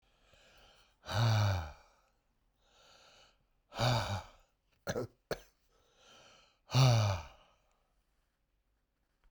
{"exhalation_length": "9.3 s", "exhalation_amplitude": 5321, "exhalation_signal_mean_std_ratio": 0.36, "survey_phase": "beta (2021-08-13 to 2022-03-07)", "age": "65+", "gender": "Male", "wearing_mask": "No", "symptom_cough_any": true, "symptom_runny_or_blocked_nose": true, "symptom_diarrhoea": true, "symptom_headache": true, "symptom_onset": "5 days", "smoker_status": "Ex-smoker", "respiratory_condition_asthma": false, "respiratory_condition_other": false, "recruitment_source": "Test and Trace", "submission_delay": "1 day", "covid_test_result": "Positive", "covid_test_method": "RT-qPCR", "covid_ct_value": 17.4, "covid_ct_gene": "S gene", "covid_ct_mean": 18.1, "covid_viral_load": "1200000 copies/ml", "covid_viral_load_category": "High viral load (>1M copies/ml)"}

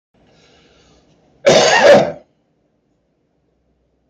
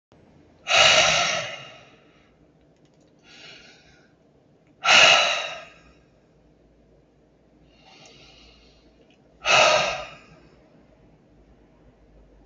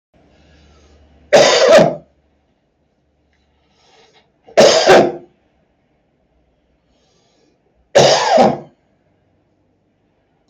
{"cough_length": "4.1 s", "cough_amplitude": 32767, "cough_signal_mean_std_ratio": 0.33, "exhalation_length": "12.5 s", "exhalation_amplitude": 27551, "exhalation_signal_mean_std_ratio": 0.33, "three_cough_length": "10.5 s", "three_cough_amplitude": 32457, "three_cough_signal_mean_std_ratio": 0.34, "survey_phase": "beta (2021-08-13 to 2022-03-07)", "age": "65+", "gender": "Male", "wearing_mask": "No", "symptom_cough_any": true, "symptom_onset": "2 days", "smoker_status": "Never smoked", "respiratory_condition_asthma": false, "respiratory_condition_other": true, "recruitment_source": "REACT", "submission_delay": "2 days", "covid_test_result": "Negative", "covid_test_method": "RT-qPCR", "influenza_a_test_result": "Negative", "influenza_b_test_result": "Negative"}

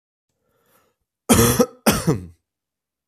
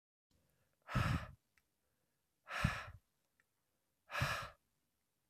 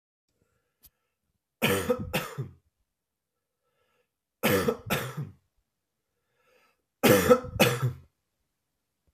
{"cough_length": "3.1 s", "cough_amplitude": 32546, "cough_signal_mean_std_ratio": 0.36, "exhalation_length": "5.3 s", "exhalation_amplitude": 3261, "exhalation_signal_mean_std_ratio": 0.34, "three_cough_length": "9.1 s", "three_cough_amplitude": 18336, "three_cough_signal_mean_std_ratio": 0.33, "survey_phase": "beta (2021-08-13 to 2022-03-07)", "age": "18-44", "gender": "Male", "wearing_mask": "No", "symptom_runny_or_blocked_nose": true, "symptom_fatigue": true, "symptom_onset": "4 days", "smoker_status": "Ex-smoker", "respiratory_condition_asthma": false, "respiratory_condition_other": false, "recruitment_source": "Test and Trace", "submission_delay": "2 days", "covid_test_result": "Positive", "covid_test_method": "RT-qPCR", "covid_ct_value": 19.2, "covid_ct_gene": "ORF1ab gene", "covid_ct_mean": 19.7, "covid_viral_load": "350000 copies/ml", "covid_viral_load_category": "Low viral load (10K-1M copies/ml)"}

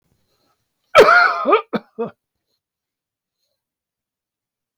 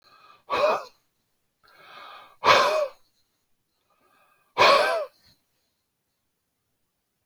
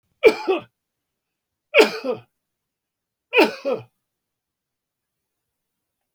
{"cough_length": "4.8 s", "cough_amplitude": 32768, "cough_signal_mean_std_ratio": 0.29, "exhalation_length": "7.3 s", "exhalation_amplitude": 22071, "exhalation_signal_mean_std_ratio": 0.33, "three_cough_length": "6.1 s", "three_cough_amplitude": 29045, "three_cough_signal_mean_std_ratio": 0.26, "survey_phase": "alpha (2021-03-01 to 2021-08-12)", "age": "45-64", "gender": "Male", "wearing_mask": "No", "symptom_none": true, "smoker_status": "Never smoked", "respiratory_condition_asthma": false, "respiratory_condition_other": false, "recruitment_source": "REACT", "submission_delay": "2 days", "covid_test_result": "Negative", "covid_test_method": "RT-qPCR"}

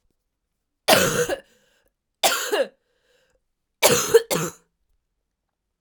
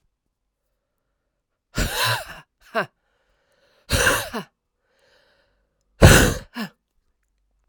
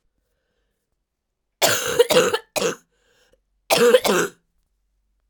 {"three_cough_length": "5.8 s", "three_cough_amplitude": 32767, "three_cough_signal_mean_std_ratio": 0.36, "exhalation_length": "7.7 s", "exhalation_amplitude": 32768, "exhalation_signal_mean_std_ratio": 0.28, "cough_length": "5.3 s", "cough_amplitude": 32632, "cough_signal_mean_std_ratio": 0.39, "survey_phase": "alpha (2021-03-01 to 2021-08-12)", "age": "18-44", "gender": "Female", "wearing_mask": "No", "symptom_cough_any": true, "symptom_new_continuous_cough": true, "symptom_shortness_of_breath": true, "symptom_fatigue": true, "symptom_fever_high_temperature": true, "symptom_headache": true, "symptom_change_to_sense_of_smell_or_taste": true, "symptom_loss_of_taste": true, "symptom_onset": "3 days", "smoker_status": "Never smoked", "respiratory_condition_asthma": false, "respiratory_condition_other": false, "recruitment_source": "Test and Trace", "submission_delay": "2 days", "covid_test_result": "Positive", "covid_test_method": "RT-qPCR", "covid_ct_value": 21.2, "covid_ct_gene": "ORF1ab gene"}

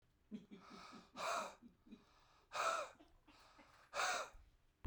{"exhalation_length": "4.9 s", "exhalation_amplitude": 1381, "exhalation_signal_mean_std_ratio": 0.47, "survey_phase": "beta (2021-08-13 to 2022-03-07)", "age": "45-64", "gender": "Male", "wearing_mask": "No", "symptom_none": true, "smoker_status": "Ex-smoker", "respiratory_condition_asthma": false, "respiratory_condition_other": false, "recruitment_source": "REACT", "submission_delay": "4 days", "covid_test_result": "Negative", "covid_test_method": "RT-qPCR"}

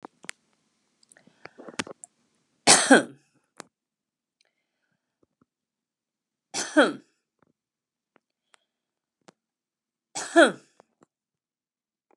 {"three_cough_length": "12.2 s", "three_cough_amplitude": 27528, "three_cough_signal_mean_std_ratio": 0.19, "survey_phase": "beta (2021-08-13 to 2022-03-07)", "age": "65+", "gender": "Female", "wearing_mask": "No", "symptom_none": true, "smoker_status": "Never smoked", "respiratory_condition_asthma": false, "respiratory_condition_other": false, "recruitment_source": "REACT", "submission_delay": "3 days", "covid_test_result": "Negative", "covid_test_method": "RT-qPCR", "influenza_a_test_result": "Negative", "influenza_b_test_result": "Negative"}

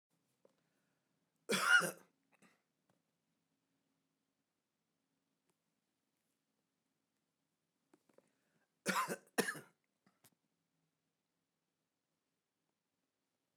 {"cough_length": "13.6 s", "cough_amplitude": 4035, "cough_signal_mean_std_ratio": 0.18, "survey_phase": "beta (2021-08-13 to 2022-03-07)", "age": "45-64", "gender": "Male", "wearing_mask": "No", "symptom_none": true, "smoker_status": "Ex-smoker", "respiratory_condition_asthma": false, "respiratory_condition_other": false, "recruitment_source": "REACT", "submission_delay": "3 days", "covid_test_result": "Negative", "covid_test_method": "RT-qPCR"}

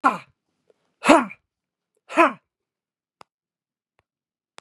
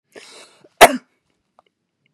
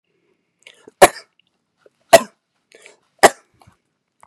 {"exhalation_length": "4.6 s", "exhalation_amplitude": 32767, "exhalation_signal_mean_std_ratio": 0.22, "cough_length": "2.1 s", "cough_amplitude": 32768, "cough_signal_mean_std_ratio": 0.18, "three_cough_length": "4.3 s", "three_cough_amplitude": 32768, "three_cough_signal_mean_std_ratio": 0.17, "survey_phase": "beta (2021-08-13 to 2022-03-07)", "age": "65+", "gender": "Female", "wearing_mask": "No", "symptom_cough_any": true, "smoker_status": "Ex-smoker", "respiratory_condition_asthma": false, "respiratory_condition_other": false, "recruitment_source": "REACT", "submission_delay": "2 days", "covid_test_result": "Negative", "covid_test_method": "RT-qPCR", "influenza_a_test_result": "Negative", "influenza_b_test_result": "Negative"}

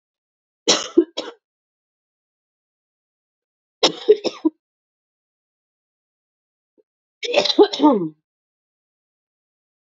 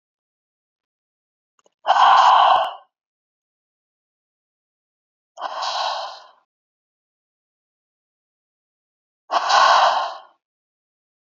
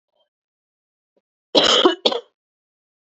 {"three_cough_length": "10.0 s", "three_cough_amplitude": 29449, "three_cough_signal_mean_std_ratio": 0.25, "exhalation_length": "11.3 s", "exhalation_amplitude": 26180, "exhalation_signal_mean_std_ratio": 0.33, "cough_length": "3.2 s", "cough_amplitude": 31386, "cough_signal_mean_std_ratio": 0.31, "survey_phase": "beta (2021-08-13 to 2022-03-07)", "age": "18-44", "gender": "Female", "wearing_mask": "No", "symptom_none": true, "smoker_status": "Never smoked", "respiratory_condition_asthma": false, "respiratory_condition_other": false, "recruitment_source": "REACT", "submission_delay": "1 day", "covid_test_result": "Negative", "covid_test_method": "RT-qPCR", "influenza_a_test_result": "Negative", "influenza_b_test_result": "Negative"}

